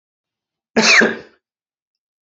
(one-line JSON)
{"cough_length": "2.2 s", "cough_amplitude": 31353, "cough_signal_mean_std_ratio": 0.34, "survey_phase": "beta (2021-08-13 to 2022-03-07)", "age": "18-44", "gender": "Male", "wearing_mask": "No", "symptom_runny_or_blocked_nose": true, "symptom_sore_throat": true, "symptom_fatigue": true, "symptom_onset": "2 days", "smoker_status": "Current smoker (1 to 10 cigarettes per day)", "respiratory_condition_asthma": false, "respiratory_condition_other": false, "recruitment_source": "REACT", "submission_delay": "-1 day", "covid_test_result": "Negative", "covid_test_method": "RT-qPCR", "influenza_a_test_result": "Negative", "influenza_b_test_result": "Negative"}